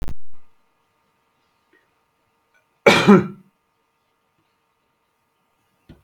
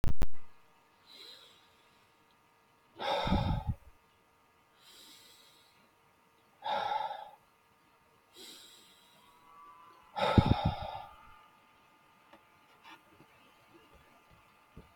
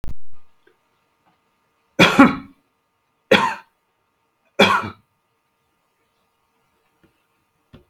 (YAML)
cough_length: 6.0 s
cough_amplitude: 32768
cough_signal_mean_std_ratio: 0.27
exhalation_length: 15.0 s
exhalation_amplitude: 10827
exhalation_signal_mean_std_ratio: 0.3
three_cough_length: 7.9 s
three_cough_amplitude: 32768
three_cough_signal_mean_std_ratio: 0.29
survey_phase: beta (2021-08-13 to 2022-03-07)
age: 45-64
gender: Female
wearing_mask: 'No'
symptom_cough_any: true
symptom_sore_throat: true
symptom_fatigue: true
symptom_headache: true
smoker_status: Ex-smoker
respiratory_condition_asthma: false
respiratory_condition_other: false
recruitment_source: Test and Trace
submission_delay: 1 day
covid_test_result: Negative
covid_test_method: RT-qPCR